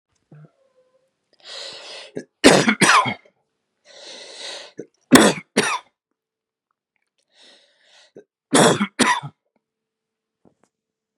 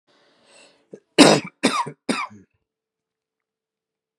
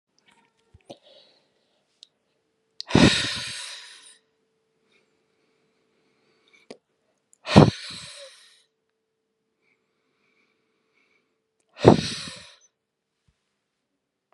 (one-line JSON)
{"three_cough_length": "11.2 s", "three_cough_amplitude": 32768, "three_cough_signal_mean_std_ratio": 0.3, "cough_length": "4.2 s", "cough_amplitude": 32768, "cough_signal_mean_std_ratio": 0.25, "exhalation_length": "14.3 s", "exhalation_amplitude": 32767, "exhalation_signal_mean_std_ratio": 0.19, "survey_phase": "beta (2021-08-13 to 2022-03-07)", "age": "18-44", "gender": "Male", "wearing_mask": "No", "symptom_none": true, "smoker_status": "Ex-smoker", "respiratory_condition_asthma": false, "respiratory_condition_other": false, "recruitment_source": "REACT", "submission_delay": "1 day", "covid_test_result": "Negative", "covid_test_method": "RT-qPCR", "influenza_a_test_result": "Negative", "influenza_b_test_result": "Negative"}